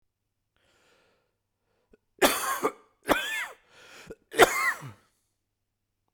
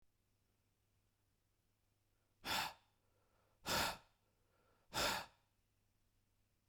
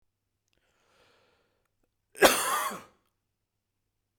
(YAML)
three_cough_length: 6.1 s
three_cough_amplitude: 30838
three_cough_signal_mean_std_ratio: 0.3
exhalation_length: 6.7 s
exhalation_amplitude: 1736
exhalation_signal_mean_std_ratio: 0.3
cough_length: 4.2 s
cough_amplitude: 25781
cough_signal_mean_std_ratio: 0.23
survey_phase: beta (2021-08-13 to 2022-03-07)
age: 18-44
gender: Male
wearing_mask: 'No'
symptom_cough_any: true
symptom_shortness_of_breath: true
symptom_fatigue: true
symptom_headache: true
symptom_onset: 13 days
smoker_status: Current smoker (e-cigarettes or vapes only)
respiratory_condition_asthma: false
respiratory_condition_other: false
recruitment_source: REACT
submission_delay: 0 days
covid_test_result: Negative
covid_test_method: RT-qPCR
influenza_a_test_result: Negative
influenza_b_test_result: Negative